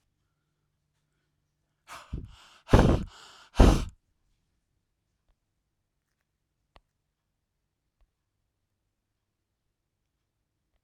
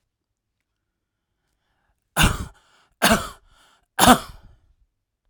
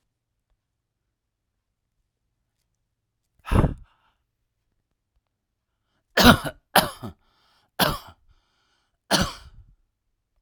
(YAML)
exhalation_length: 10.8 s
exhalation_amplitude: 24773
exhalation_signal_mean_std_ratio: 0.18
three_cough_length: 5.3 s
three_cough_amplitude: 32768
three_cough_signal_mean_std_ratio: 0.26
cough_length: 10.4 s
cough_amplitude: 32768
cough_signal_mean_std_ratio: 0.22
survey_phase: alpha (2021-03-01 to 2021-08-12)
age: 65+
gender: Male
wearing_mask: 'No'
symptom_none: true
smoker_status: Ex-smoker
respiratory_condition_asthma: false
respiratory_condition_other: false
recruitment_source: REACT
submission_delay: 3 days
covid_test_result: Negative
covid_test_method: RT-qPCR